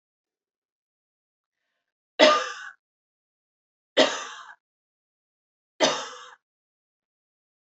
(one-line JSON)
{"three_cough_length": "7.7 s", "three_cough_amplitude": 26542, "three_cough_signal_mean_std_ratio": 0.23, "survey_phase": "beta (2021-08-13 to 2022-03-07)", "age": "18-44", "gender": "Female", "wearing_mask": "No", "symptom_none": true, "smoker_status": "Never smoked", "respiratory_condition_asthma": false, "respiratory_condition_other": false, "recruitment_source": "REACT", "submission_delay": "1 day", "covid_test_result": "Negative", "covid_test_method": "RT-qPCR", "influenza_a_test_result": "Negative", "influenza_b_test_result": "Negative"}